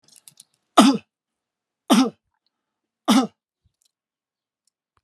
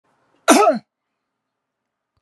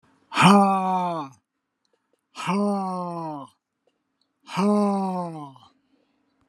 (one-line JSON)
{"three_cough_length": "5.0 s", "three_cough_amplitude": 32768, "three_cough_signal_mean_std_ratio": 0.26, "cough_length": "2.2 s", "cough_amplitude": 32767, "cough_signal_mean_std_ratio": 0.29, "exhalation_length": "6.5 s", "exhalation_amplitude": 31133, "exhalation_signal_mean_std_ratio": 0.5, "survey_phase": "alpha (2021-03-01 to 2021-08-12)", "age": "65+", "gender": "Male", "wearing_mask": "No", "symptom_none": true, "smoker_status": "Never smoked", "respiratory_condition_asthma": false, "respiratory_condition_other": false, "recruitment_source": "REACT", "submission_delay": "3 days", "covid_test_result": "Negative", "covid_test_method": "RT-qPCR"}